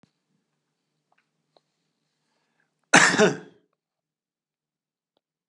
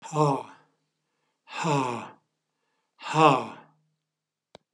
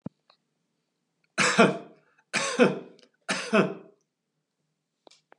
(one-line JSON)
{"cough_length": "5.5 s", "cough_amplitude": 31296, "cough_signal_mean_std_ratio": 0.2, "exhalation_length": "4.7 s", "exhalation_amplitude": 23073, "exhalation_signal_mean_std_ratio": 0.35, "three_cough_length": "5.4 s", "three_cough_amplitude": 21275, "three_cough_signal_mean_std_ratio": 0.33, "survey_phase": "beta (2021-08-13 to 2022-03-07)", "age": "65+", "gender": "Male", "wearing_mask": "No", "symptom_none": true, "smoker_status": "Ex-smoker", "respiratory_condition_asthma": false, "respiratory_condition_other": false, "recruitment_source": "REACT", "submission_delay": "2 days", "covid_test_result": "Negative", "covid_test_method": "RT-qPCR", "influenza_a_test_result": "Negative", "influenza_b_test_result": "Negative"}